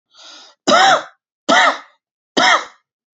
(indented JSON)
{
  "three_cough_length": "3.2 s",
  "three_cough_amplitude": 29793,
  "three_cough_signal_mean_std_ratio": 0.46,
  "survey_phase": "beta (2021-08-13 to 2022-03-07)",
  "age": "45-64",
  "gender": "Male",
  "wearing_mask": "No",
  "symptom_none": true,
  "smoker_status": "Ex-smoker",
  "respiratory_condition_asthma": false,
  "respiratory_condition_other": false,
  "recruitment_source": "REACT",
  "submission_delay": "2 days",
  "covid_test_result": "Negative",
  "covid_test_method": "RT-qPCR",
  "influenza_a_test_result": "Negative",
  "influenza_b_test_result": "Negative"
}